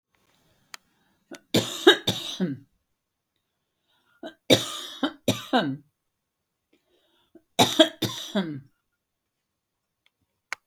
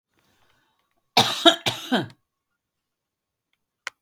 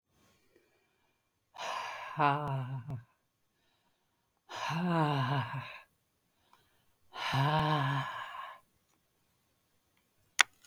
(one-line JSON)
{"three_cough_length": "10.7 s", "three_cough_amplitude": 32397, "three_cough_signal_mean_std_ratio": 0.28, "cough_length": "4.0 s", "cough_amplitude": 32206, "cough_signal_mean_std_ratio": 0.26, "exhalation_length": "10.7 s", "exhalation_amplitude": 23627, "exhalation_signal_mean_std_ratio": 0.44, "survey_phase": "beta (2021-08-13 to 2022-03-07)", "age": "65+", "gender": "Female", "wearing_mask": "No", "symptom_none": true, "smoker_status": "Ex-smoker", "respiratory_condition_asthma": false, "respiratory_condition_other": false, "recruitment_source": "REACT", "submission_delay": "3 days", "covid_test_result": "Negative", "covid_test_method": "RT-qPCR", "influenza_a_test_result": "Negative", "influenza_b_test_result": "Negative"}